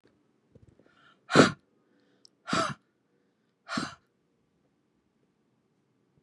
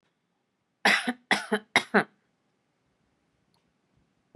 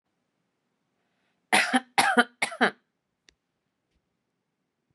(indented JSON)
{
  "exhalation_length": "6.2 s",
  "exhalation_amplitude": 19356,
  "exhalation_signal_mean_std_ratio": 0.2,
  "three_cough_length": "4.4 s",
  "three_cough_amplitude": 20748,
  "three_cough_signal_mean_std_ratio": 0.26,
  "cough_length": "4.9 s",
  "cough_amplitude": 21340,
  "cough_signal_mean_std_ratio": 0.26,
  "survey_phase": "beta (2021-08-13 to 2022-03-07)",
  "age": "18-44",
  "gender": "Female",
  "wearing_mask": "No",
  "symptom_none": true,
  "smoker_status": "Never smoked",
  "respiratory_condition_asthma": false,
  "respiratory_condition_other": false,
  "recruitment_source": "REACT",
  "submission_delay": "2 days",
  "covid_test_result": "Negative",
  "covid_test_method": "RT-qPCR"
}